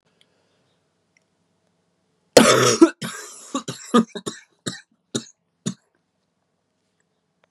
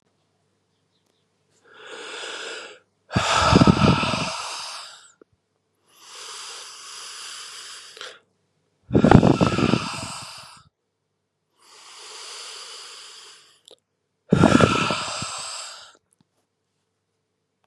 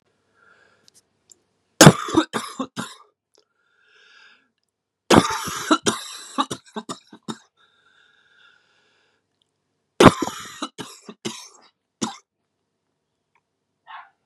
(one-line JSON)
{"cough_length": "7.5 s", "cough_amplitude": 32768, "cough_signal_mean_std_ratio": 0.25, "exhalation_length": "17.7 s", "exhalation_amplitude": 32768, "exhalation_signal_mean_std_ratio": 0.35, "three_cough_length": "14.3 s", "three_cough_amplitude": 32768, "three_cough_signal_mean_std_ratio": 0.22, "survey_phase": "beta (2021-08-13 to 2022-03-07)", "age": "18-44", "gender": "Male", "wearing_mask": "No", "symptom_cough_any": true, "symptom_new_continuous_cough": true, "symptom_runny_or_blocked_nose": true, "symptom_shortness_of_breath": true, "symptom_fatigue": true, "symptom_onset": "3 days", "smoker_status": "Never smoked", "respiratory_condition_asthma": false, "respiratory_condition_other": false, "recruitment_source": "Test and Trace", "submission_delay": "2 days", "covid_test_result": "Positive", "covid_test_method": "RT-qPCR", "covid_ct_value": 20.2, "covid_ct_gene": "N gene"}